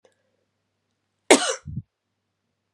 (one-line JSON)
{"cough_length": "2.7 s", "cough_amplitude": 32768, "cough_signal_mean_std_ratio": 0.2, "survey_phase": "beta (2021-08-13 to 2022-03-07)", "age": "18-44", "gender": "Female", "wearing_mask": "No", "symptom_cough_any": true, "symptom_runny_or_blocked_nose": true, "symptom_sore_throat": true, "symptom_fatigue": true, "symptom_fever_high_temperature": true, "symptom_headache": true, "symptom_change_to_sense_of_smell_or_taste": true, "symptom_loss_of_taste": true, "symptom_onset": "6 days", "smoker_status": "Never smoked", "respiratory_condition_asthma": false, "respiratory_condition_other": false, "recruitment_source": "Test and Trace", "submission_delay": "2 days", "covid_test_method": "RT-qPCR", "covid_ct_value": 22.6, "covid_ct_gene": "ORF1ab gene"}